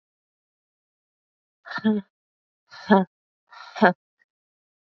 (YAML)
exhalation_length: 4.9 s
exhalation_amplitude: 25043
exhalation_signal_mean_std_ratio: 0.24
survey_phase: beta (2021-08-13 to 2022-03-07)
age: 18-44
gender: Female
wearing_mask: 'No'
symptom_cough_any: true
symptom_runny_or_blocked_nose: true
symptom_shortness_of_breath: true
symptom_onset: 5 days
smoker_status: Never smoked
respiratory_condition_asthma: false
respiratory_condition_other: false
recruitment_source: Test and Trace
submission_delay: 2 days
covid_test_result: Positive
covid_test_method: RT-qPCR
covid_ct_value: 29.5
covid_ct_gene: N gene